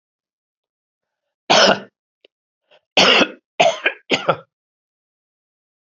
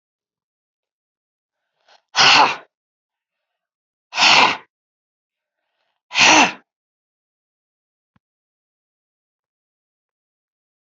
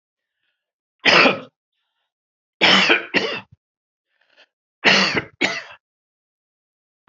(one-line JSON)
{"cough_length": "5.9 s", "cough_amplitude": 32768, "cough_signal_mean_std_ratio": 0.32, "exhalation_length": "10.9 s", "exhalation_amplitude": 32767, "exhalation_signal_mean_std_ratio": 0.25, "three_cough_length": "7.1 s", "three_cough_amplitude": 28762, "three_cough_signal_mean_std_ratio": 0.35, "survey_phase": "alpha (2021-03-01 to 2021-08-12)", "age": "65+", "gender": "Male", "wearing_mask": "No", "symptom_cough_any": true, "symptom_fatigue": true, "symptom_headache": true, "symptom_onset": "8 days", "smoker_status": "Never smoked", "respiratory_condition_asthma": false, "respiratory_condition_other": false, "recruitment_source": "Test and Trace", "submission_delay": "2 days", "covid_test_result": "Positive", "covid_test_method": "RT-qPCR", "covid_ct_value": 15.0, "covid_ct_gene": "ORF1ab gene", "covid_ct_mean": 15.4, "covid_viral_load": "8900000 copies/ml", "covid_viral_load_category": "High viral load (>1M copies/ml)"}